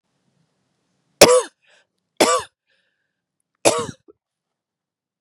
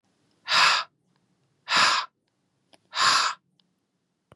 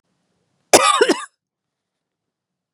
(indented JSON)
{
  "three_cough_length": "5.2 s",
  "three_cough_amplitude": 32768,
  "three_cough_signal_mean_std_ratio": 0.24,
  "exhalation_length": "4.4 s",
  "exhalation_amplitude": 15687,
  "exhalation_signal_mean_std_ratio": 0.4,
  "cough_length": "2.7 s",
  "cough_amplitude": 32768,
  "cough_signal_mean_std_ratio": 0.29,
  "survey_phase": "beta (2021-08-13 to 2022-03-07)",
  "age": "45-64",
  "gender": "Female",
  "wearing_mask": "No",
  "symptom_cough_any": true,
  "symptom_runny_or_blocked_nose": true,
  "symptom_sore_throat": true,
  "symptom_fatigue": true,
  "symptom_headache": true,
  "symptom_change_to_sense_of_smell_or_taste": true,
  "symptom_onset": "5 days",
  "smoker_status": "Never smoked",
  "respiratory_condition_asthma": false,
  "respiratory_condition_other": false,
  "recruitment_source": "Test and Trace",
  "submission_delay": "2 days",
  "covid_test_result": "Positive",
  "covid_test_method": "ePCR"
}